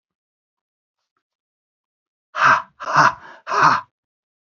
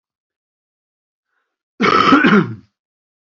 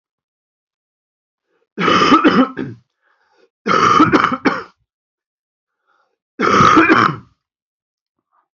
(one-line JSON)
{"exhalation_length": "4.5 s", "exhalation_amplitude": 27757, "exhalation_signal_mean_std_ratio": 0.33, "cough_length": "3.3 s", "cough_amplitude": 28846, "cough_signal_mean_std_ratio": 0.37, "three_cough_length": "8.5 s", "three_cough_amplitude": 30005, "three_cough_signal_mean_std_ratio": 0.43, "survey_phase": "beta (2021-08-13 to 2022-03-07)", "age": "45-64", "gender": "Male", "wearing_mask": "No", "symptom_cough_any": true, "symptom_runny_or_blocked_nose": true, "symptom_sore_throat": true, "symptom_fatigue": true, "symptom_onset": "3 days", "smoker_status": "Never smoked", "respiratory_condition_asthma": false, "respiratory_condition_other": false, "recruitment_source": "Test and Trace", "submission_delay": "1 day", "covid_test_result": "Negative", "covid_test_method": "RT-qPCR"}